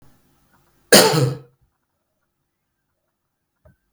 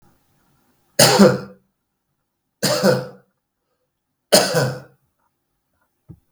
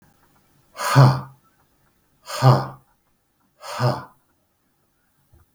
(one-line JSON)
{"cough_length": "3.9 s", "cough_amplitude": 32768, "cough_signal_mean_std_ratio": 0.24, "three_cough_length": "6.3 s", "three_cough_amplitude": 32768, "three_cough_signal_mean_std_ratio": 0.33, "exhalation_length": "5.5 s", "exhalation_amplitude": 32766, "exhalation_signal_mean_std_ratio": 0.3, "survey_phase": "beta (2021-08-13 to 2022-03-07)", "age": "45-64", "gender": "Male", "wearing_mask": "No", "symptom_none": true, "smoker_status": "Ex-smoker", "respiratory_condition_asthma": false, "respiratory_condition_other": false, "recruitment_source": "REACT", "submission_delay": "4 days", "covid_test_result": "Negative", "covid_test_method": "RT-qPCR", "influenza_a_test_result": "Negative", "influenza_b_test_result": "Negative"}